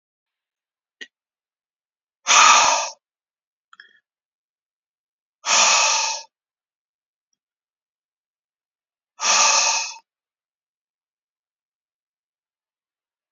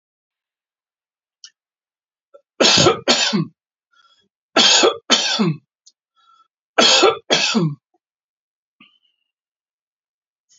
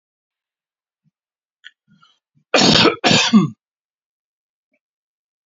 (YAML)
exhalation_length: 13.3 s
exhalation_amplitude: 30564
exhalation_signal_mean_std_ratio: 0.3
three_cough_length: 10.6 s
three_cough_amplitude: 32767
three_cough_signal_mean_std_ratio: 0.38
cough_length: 5.5 s
cough_amplitude: 32767
cough_signal_mean_std_ratio: 0.31
survey_phase: beta (2021-08-13 to 2022-03-07)
age: 65+
gender: Male
wearing_mask: 'No'
symptom_none: true
smoker_status: Ex-smoker
respiratory_condition_asthma: false
respiratory_condition_other: false
recruitment_source: REACT
submission_delay: 2 days
covid_test_result: Negative
covid_test_method: RT-qPCR
influenza_a_test_result: Negative
influenza_b_test_result: Negative